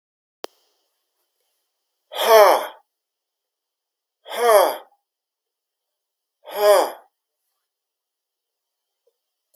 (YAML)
exhalation_length: 9.6 s
exhalation_amplitude: 32766
exhalation_signal_mean_std_ratio: 0.27
survey_phase: beta (2021-08-13 to 2022-03-07)
age: 45-64
gender: Male
wearing_mask: 'No'
symptom_other: true
symptom_onset: 5 days
smoker_status: Never smoked
respiratory_condition_asthma: false
respiratory_condition_other: false
recruitment_source: REACT
submission_delay: 1 day
covid_test_result: Negative
covid_test_method: RT-qPCR
influenza_a_test_result: Negative
influenza_b_test_result: Negative